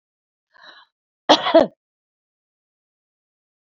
{
  "cough_length": "3.8 s",
  "cough_amplitude": 28911,
  "cough_signal_mean_std_ratio": 0.2,
  "survey_phase": "beta (2021-08-13 to 2022-03-07)",
  "age": "45-64",
  "gender": "Female",
  "wearing_mask": "No",
  "symptom_none": true,
  "smoker_status": "Current smoker (e-cigarettes or vapes only)",
  "respiratory_condition_asthma": false,
  "respiratory_condition_other": false,
  "recruitment_source": "REACT",
  "submission_delay": "4 days",
  "covid_test_result": "Negative",
  "covid_test_method": "RT-qPCR",
  "influenza_a_test_result": "Unknown/Void",
  "influenza_b_test_result": "Unknown/Void"
}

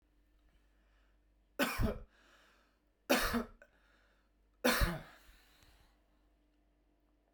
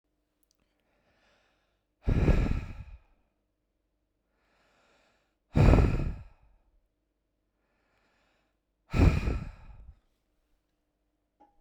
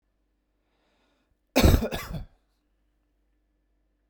{
  "three_cough_length": "7.3 s",
  "three_cough_amplitude": 5672,
  "three_cough_signal_mean_std_ratio": 0.32,
  "exhalation_length": "11.6 s",
  "exhalation_amplitude": 13960,
  "exhalation_signal_mean_std_ratio": 0.29,
  "cough_length": "4.1 s",
  "cough_amplitude": 16242,
  "cough_signal_mean_std_ratio": 0.24,
  "survey_phase": "beta (2021-08-13 to 2022-03-07)",
  "age": "18-44",
  "gender": "Male",
  "wearing_mask": "No",
  "symptom_none": true,
  "smoker_status": "Never smoked",
  "respiratory_condition_asthma": false,
  "respiratory_condition_other": false,
  "recruitment_source": "REACT",
  "submission_delay": "2 days",
  "covid_test_result": "Negative",
  "covid_test_method": "RT-qPCR"
}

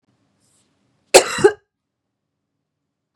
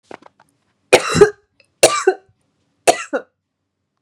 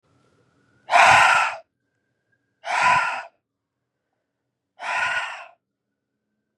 {
  "cough_length": "3.2 s",
  "cough_amplitude": 32768,
  "cough_signal_mean_std_ratio": 0.2,
  "three_cough_length": "4.0 s",
  "three_cough_amplitude": 32768,
  "three_cough_signal_mean_std_ratio": 0.3,
  "exhalation_length": "6.6 s",
  "exhalation_amplitude": 31905,
  "exhalation_signal_mean_std_ratio": 0.37,
  "survey_phase": "beta (2021-08-13 to 2022-03-07)",
  "age": "18-44",
  "gender": "Female",
  "wearing_mask": "No",
  "symptom_cough_any": true,
  "symptom_new_continuous_cough": true,
  "symptom_runny_or_blocked_nose": true,
  "symptom_sore_throat": true,
  "symptom_fatigue": true,
  "symptom_fever_high_temperature": true,
  "symptom_onset": "4 days",
  "smoker_status": "Never smoked",
  "respiratory_condition_asthma": false,
  "respiratory_condition_other": false,
  "recruitment_source": "Test and Trace",
  "submission_delay": "2 days",
  "covid_test_result": "Positive",
  "covid_test_method": "RT-qPCR",
  "covid_ct_value": 17.1,
  "covid_ct_gene": "N gene",
  "covid_ct_mean": 17.8,
  "covid_viral_load": "1500000 copies/ml",
  "covid_viral_load_category": "High viral load (>1M copies/ml)"
}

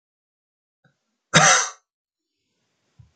{
  "cough_length": "3.2 s",
  "cough_amplitude": 29239,
  "cough_signal_mean_std_ratio": 0.25,
  "survey_phase": "beta (2021-08-13 to 2022-03-07)",
  "age": "45-64",
  "gender": "Male",
  "wearing_mask": "No",
  "symptom_cough_any": true,
  "symptom_runny_or_blocked_nose": true,
  "symptom_headache": true,
  "symptom_onset": "4 days",
  "smoker_status": "Never smoked",
  "respiratory_condition_asthma": false,
  "respiratory_condition_other": false,
  "recruitment_source": "Test and Trace",
  "submission_delay": "1 day",
  "covid_test_result": "Positive",
  "covid_test_method": "LAMP"
}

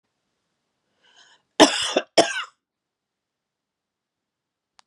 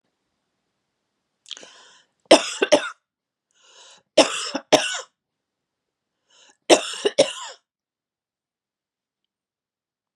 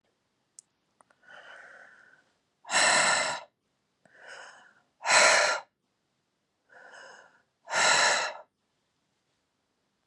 {
  "cough_length": "4.9 s",
  "cough_amplitude": 32767,
  "cough_signal_mean_std_ratio": 0.21,
  "three_cough_length": "10.2 s",
  "three_cough_amplitude": 32767,
  "three_cough_signal_mean_std_ratio": 0.23,
  "exhalation_length": "10.1 s",
  "exhalation_amplitude": 15331,
  "exhalation_signal_mean_std_ratio": 0.36,
  "survey_phase": "beta (2021-08-13 to 2022-03-07)",
  "age": "45-64",
  "gender": "Female",
  "wearing_mask": "No",
  "symptom_sore_throat": true,
  "symptom_fatigue": true,
  "symptom_headache": true,
  "smoker_status": "Ex-smoker",
  "respiratory_condition_asthma": false,
  "respiratory_condition_other": false,
  "recruitment_source": "REACT",
  "submission_delay": "1 day",
  "covid_test_result": "Negative",
  "covid_test_method": "RT-qPCR",
  "influenza_a_test_result": "Unknown/Void",
  "influenza_b_test_result": "Unknown/Void"
}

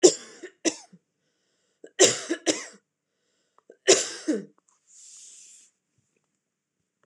{
  "three_cough_length": "7.1 s",
  "three_cough_amplitude": 26027,
  "three_cough_signal_mean_std_ratio": 0.25,
  "survey_phase": "beta (2021-08-13 to 2022-03-07)",
  "age": "45-64",
  "gender": "Female",
  "wearing_mask": "No",
  "symptom_fatigue": true,
  "symptom_headache": true,
  "symptom_onset": "12 days",
  "smoker_status": "Ex-smoker",
  "respiratory_condition_asthma": false,
  "respiratory_condition_other": false,
  "recruitment_source": "REACT",
  "submission_delay": "3 days",
  "covid_test_result": "Negative",
  "covid_test_method": "RT-qPCR",
  "influenza_a_test_result": "Negative",
  "influenza_b_test_result": "Negative"
}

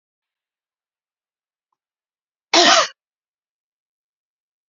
{
  "cough_length": "4.7 s",
  "cough_amplitude": 31683,
  "cough_signal_mean_std_ratio": 0.21,
  "survey_phase": "beta (2021-08-13 to 2022-03-07)",
  "age": "65+",
  "gender": "Female",
  "wearing_mask": "No",
  "symptom_none": true,
  "smoker_status": "Ex-smoker",
  "respiratory_condition_asthma": false,
  "respiratory_condition_other": false,
  "recruitment_source": "REACT",
  "submission_delay": "1 day",
  "covid_test_result": "Negative",
  "covid_test_method": "RT-qPCR"
}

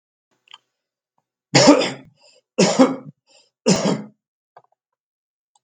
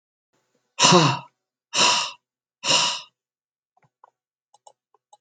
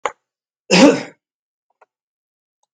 {
  "three_cough_length": "5.6 s",
  "three_cough_amplitude": 32768,
  "three_cough_signal_mean_std_ratio": 0.32,
  "exhalation_length": "5.2 s",
  "exhalation_amplitude": 32766,
  "exhalation_signal_mean_std_ratio": 0.35,
  "cough_length": "2.7 s",
  "cough_amplitude": 32768,
  "cough_signal_mean_std_ratio": 0.26,
  "survey_phase": "beta (2021-08-13 to 2022-03-07)",
  "age": "45-64",
  "gender": "Male",
  "wearing_mask": "Yes",
  "symptom_none": true,
  "smoker_status": "Never smoked",
  "respiratory_condition_asthma": false,
  "respiratory_condition_other": false,
  "recruitment_source": "REACT",
  "submission_delay": "1 day",
  "covid_test_result": "Negative",
  "covid_test_method": "RT-qPCR"
}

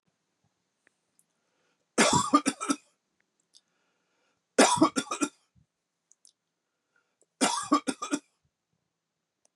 {
  "three_cough_length": "9.6 s",
  "three_cough_amplitude": 14250,
  "three_cough_signal_mean_std_ratio": 0.29,
  "survey_phase": "beta (2021-08-13 to 2022-03-07)",
  "age": "45-64",
  "gender": "Male",
  "wearing_mask": "No",
  "symptom_cough_any": true,
  "symptom_fatigue": true,
  "symptom_headache": true,
  "symptom_onset": "6 days",
  "smoker_status": "Ex-smoker",
  "respiratory_condition_asthma": false,
  "respiratory_condition_other": false,
  "recruitment_source": "Test and Trace",
  "submission_delay": "2 days",
  "covid_test_result": "Positive",
  "covid_test_method": "RT-qPCR"
}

